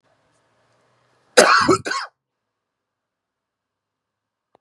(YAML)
cough_length: 4.6 s
cough_amplitude: 32768
cough_signal_mean_std_ratio: 0.25
survey_phase: beta (2021-08-13 to 2022-03-07)
age: 18-44
wearing_mask: 'No'
symptom_cough_any: true
symptom_runny_or_blocked_nose: true
symptom_sore_throat: true
symptom_fatigue: true
symptom_fever_high_temperature: true
symptom_headache: true
symptom_onset: 8 days
smoker_status: Never smoked
respiratory_condition_asthma: false
respiratory_condition_other: false
recruitment_source: Test and Trace
submission_delay: 6 days
covid_test_result: Positive
covid_test_method: RT-qPCR
covid_ct_value: 14.2
covid_ct_gene: N gene